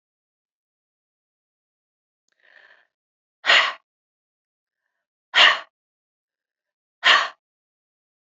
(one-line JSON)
{"exhalation_length": "8.4 s", "exhalation_amplitude": 25765, "exhalation_signal_mean_std_ratio": 0.22, "survey_phase": "beta (2021-08-13 to 2022-03-07)", "age": "65+", "gender": "Female", "wearing_mask": "No", "symptom_none": true, "smoker_status": "Ex-smoker", "respiratory_condition_asthma": false, "respiratory_condition_other": false, "recruitment_source": "REACT", "submission_delay": "2 days", "covid_test_result": "Negative", "covid_test_method": "RT-qPCR", "influenza_a_test_result": "Negative", "influenza_b_test_result": "Negative"}